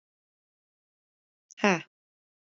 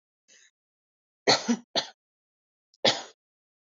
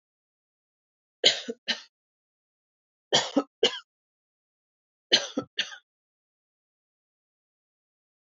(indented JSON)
{
  "exhalation_length": "2.5 s",
  "exhalation_amplitude": 13629,
  "exhalation_signal_mean_std_ratio": 0.17,
  "cough_length": "3.7 s",
  "cough_amplitude": 16556,
  "cough_signal_mean_std_ratio": 0.27,
  "three_cough_length": "8.4 s",
  "three_cough_amplitude": 22295,
  "three_cough_signal_mean_std_ratio": 0.22,
  "survey_phase": "alpha (2021-03-01 to 2021-08-12)",
  "age": "18-44",
  "gender": "Female",
  "wearing_mask": "No",
  "symptom_none": true,
  "smoker_status": "Never smoked",
  "respiratory_condition_asthma": false,
  "respiratory_condition_other": false,
  "recruitment_source": "REACT",
  "submission_delay": "2 days",
  "covid_test_result": "Negative",
  "covid_test_method": "RT-qPCR"
}